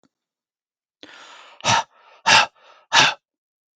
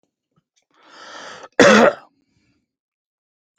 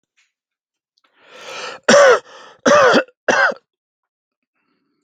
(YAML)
exhalation_length: 3.8 s
exhalation_amplitude: 32768
exhalation_signal_mean_std_ratio: 0.32
cough_length: 3.6 s
cough_amplitude: 32768
cough_signal_mean_std_ratio: 0.26
three_cough_length: 5.0 s
three_cough_amplitude: 32768
three_cough_signal_mean_std_ratio: 0.37
survey_phase: beta (2021-08-13 to 2022-03-07)
age: 45-64
gender: Male
wearing_mask: 'No'
symptom_none: true
smoker_status: Ex-smoker
respiratory_condition_asthma: false
respiratory_condition_other: false
recruitment_source: REACT
submission_delay: 5 days
covid_test_result: Negative
covid_test_method: RT-qPCR
influenza_a_test_result: Negative
influenza_b_test_result: Negative